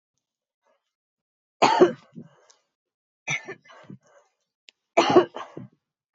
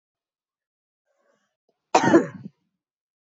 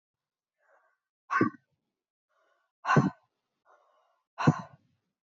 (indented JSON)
{
  "three_cough_length": "6.1 s",
  "three_cough_amplitude": 20717,
  "three_cough_signal_mean_std_ratio": 0.26,
  "cough_length": "3.2 s",
  "cough_amplitude": 20806,
  "cough_signal_mean_std_ratio": 0.23,
  "exhalation_length": "5.3 s",
  "exhalation_amplitude": 12849,
  "exhalation_signal_mean_std_ratio": 0.25,
  "survey_phase": "beta (2021-08-13 to 2022-03-07)",
  "age": "45-64",
  "gender": "Female",
  "wearing_mask": "No",
  "symptom_cough_any": true,
  "symptom_runny_or_blocked_nose": true,
  "symptom_onset": "2 days",
  "smoker_status": "Never smoked",
  "respiratory_condition_asthma": false,
  "respiratory_condition_other": false,
  "recruitment_source": "Test and Trace",
  "submission_delay": "1 day",
  "covid_test_result": "Positive",
  "covid_test_method": "ePCR"
}